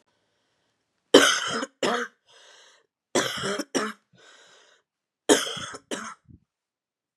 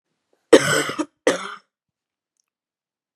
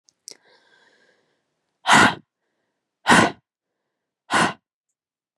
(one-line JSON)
{"three_cough_length": "7.2 s", "three_cough_amplitude": 32767, "three_cough_signal_mean_std_ratio": 0.32, "cough_length": "3.2 s", "cough_amplitude": 32768, "cough_signal_mean_std_ratio": 0.27, "exhalation_length": "5.4 s", "exhalation_amplitude": 28598, "exhalation_signal_mean_std_ratio": 0.28, "survey_phase": "beta (2021-08-13 to 2022-03-07)", "age": "18-44", "gender": "Female", "wearing_mask": "No", "symptom_cough_any": true, "symptom_new_continuous_cough": true, "symptom_runny_or_blocked_nose": true, "symptom_fatigue": true, "symptom_headache": true, "symptom_onset": "4 days", "smoker_status": "Never smoked", "respiratory_condition_asthma": false, "respiratory_condition_other": false, "recruitment_source": "Test and Trace", "submission_delay": "1 day", "covid_test_result": "Positive", "covid_test_method": "RT-qPCR"}